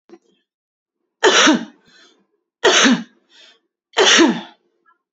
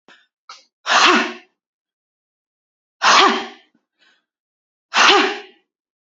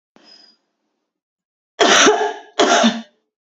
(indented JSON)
{
  "three_cough_length": "5.1 s",
  "three_cough_amplitude": 32768,
  "three_cough_signal_mean_std_ratio": 0.4,
  "exhalation_length": "6.1 s",
  "exhalation_amplitude": 31873,
  "exhalation_signal_mean_std_ratio": 0.36,
  "cough_length": "3.4 s",
  "cough_amplitude": 32133,
  "cough_signal_mean_std_ratio": 0.43,
  "survey_phase": "beta (2021-08-13 to 2022-03-07)",
  "age": "18-44",
  "gender": "Female",
  "wearing_mask": "No",
  "symptom_none": true,
  "smoker_status": "Never smoked",
  "respiratory_condition_asthma": true,
  "respiratory_condition_other": false,
  "recruitment_source": "REACT",
  "submission_delay": "0 days",
  "covid_test_result": "Negative",
  "covid_test_method": "RT-qPCR",
  "influenza_a_test_result": "Negative",
  "influenza_b_test_result": "Negative"
}